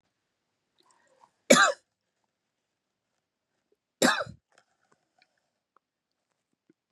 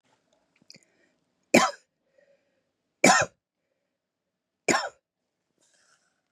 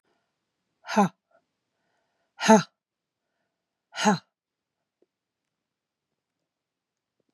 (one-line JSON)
{"cough_length": "6.9 s", "cough_amplitude": 23695, "cough_signal_mean_std_ratio": 0.18, "three_cough_length": "6.3 s", "three_cough_amplitude": 24187, "three_cough_signal_mean_std_ratio": 0.22, "exhalation_length": "7.3 s", "exhalation_amplitude": 20915, "exhalation_signal_mean_std_ratio": 0.2, "survey_phase": "beta (2021-08-13 to 2022-03-07)", "age": "45-64", "gender": "Female", "wearing_mask": "No", "symptom_none": true, "smoker_status": "Never smoked", "respiratory_condition_asthma": false, "respiratory_condition_other": false, "recruitment_source": "Test and Trace", "submission_delay": "-1 day", "covid_test_result": "Positive", "covid_test_method": "LFT"}